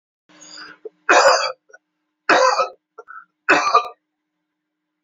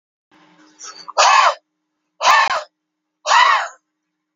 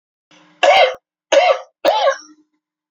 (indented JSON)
{
  "three_cough_length": "5.0 s",
  "three_cough_amplitude": 28472,
  "three_cough_signal_mean_std_ratio": 0.39,
  "exhalation_length": "4.4 s",
  "exhalation_amplitude": 30249,
  "exhalation_signal_mean_std_ratio": 0.43,
  "cough_length": "2.9 s",
  "cough_amplitude": 29312,
  "cough_signal_mean_std_ratio": 0.47,
  "survey_phase": "beta (2021-08-13 to 2022-03-07)",
  "age": "45-64",
  "gender": "Male",
  "wearing_mask": "No",
  "symptom_none": true,
  "smoker_status": "Never smoked",
  "respiratory_condition_asthma": false,
  "respiratory_condition_other": false,
  "recruitment_source": "REACT",
  "submission_delay": "1 day",
  "covid_test_result": "Negative",
  "covid_test_method": "RT-qPCR",
  "influenza_a_test_result": "Negative",
  "influenza_b_test_result": "Negative"
}